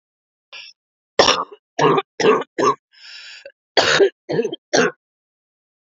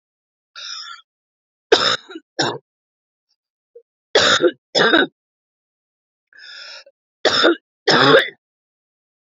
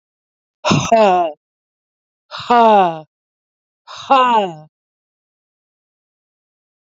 cough_length: 6.0 s
cough_amplitude: 32768
cough_signal_mean_std_ratio: 0.42
three_cough_length: 9.4 s
three_cough_amplitude: 32562
three_cough_signal_mean_std_ratio: 0.35
exhalation_length: 6.8 s
exhalation_amplitude: 29169
exhalation_signal_mean_std_ratio: 0.4
survey_phase: beta (2021-08-13 to 2022-03-07)
age: 45-64
gender: Female
wearing_mask: 'No'
symptom_cough_any: true
symptom_runny_or_blocked_nose: true
symptom_sore_throat: true
symptom_abdominal_pain: true
symptom_fatigue: true
symptom_headache: true
symptom_onset: 10 days
smoker_status: Never smoked
respiratory_condition_asthma: false
respiratory_condition_other: false
recruitment_source: REACT
submission_delay: 0 days
covid_test_result: Negative
covid_test_method: RT-qPCR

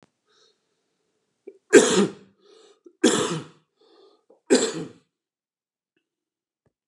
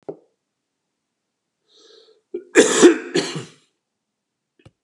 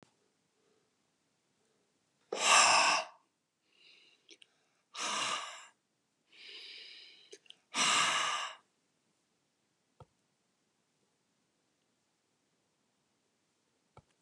three_cough_length: 6.9 s
three_cough_amplitude: 31586
three_cough_signal_mean_std_ratio: 0.27
cough_length: 4.8 s
cough_amplitude: 32767
cough_signal_mean_std_ratio: 0.26
exhalation_length: 14.2 s
exhalation_amplitude: 7777
exhalation_signal_mean_std_ratio: 0.29
survey_phase: beta (2021-08-13 to 2022-03-07)
age: 65+
gender: Male
wearing_mask: 'No'
symptom_none: true
smoker_status: Ex-smoker
respiratory_condition_asthma: false
respiratory_condition_other: false
recruitment_source: REACT
submission_delay: 2 days
covid_test_result: Negative
covid_test_method: RT-qPCR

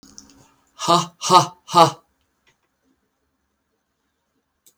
exhalation_length: 4.8 s
exhalation_amplitude: 32766
exhalation_signal_mean_std_ratio: 0.26
survey_phase: beta (2021-08-13 to 2022-03-07)
age: 65+
gender: Male
wearing_mask: 'No'
symptom_none: true
smoker_status: Ex-smoker
respiratory_condition_asthma: false
respiratory_condition_other: false
recruitment_source: REACT
submission_delay: 1 day
covid_test_result: Negative
covid_test_method: RT-qPCR
influenza_a_test_result: Negative
influenza_b_test_result: Negative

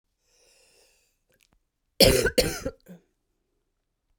cough_length: 4.2 s
cough_amplitude: 30737
cough_signal_mean_std_ratio: 0.26
survey_phase: beta (2021-08-13 to 2022-03-07)
age: 45-64
gender: Female
wearing_mask: 'No'
symptom_cough_any: true
symptom_runny_or_blocked_nose: true
symptom_sore_throat: true
symptom_fatigue: true
symptom_headache: true
smoker_status: Ex-smoker
respiratory_condition_asthma: true
respiratory_condition_other: false
recruitment_source: Test and Trace
submission_delay: 1 day
covid_test_result: Positive
covid_test_method: LFT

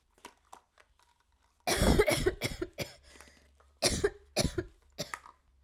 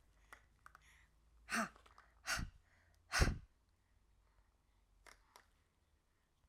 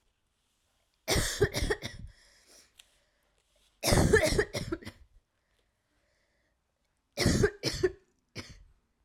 cough_length: 5.6 s
cough_amplitude: 9440
cough_signal_mean_std_ratio: 0.4
exhalation_length: 6.5 s
exhalation_amplitude: 3602
exhalation_signal_mean_std_ratio: 0.27
three_cough_length: 9.0 s
three_cough_amplitude: 9550
three_cough_signal_mean_std_ratio: 0.37
survey_phase: alpha (2021-03-01 to 2021-08-12)
age: 18-44
gender: Female
wearing_mask: 'No'
symptom_cough_any: true
symptom_onset: 12 days
smoker_status: Never smoked
respiratory_condition_asthma: false
respiratory_condition_other: false
recruitment_source: REACT
submission_delay: 2 days
covid_test_result: Negative
covid_test_method: RT-qPCR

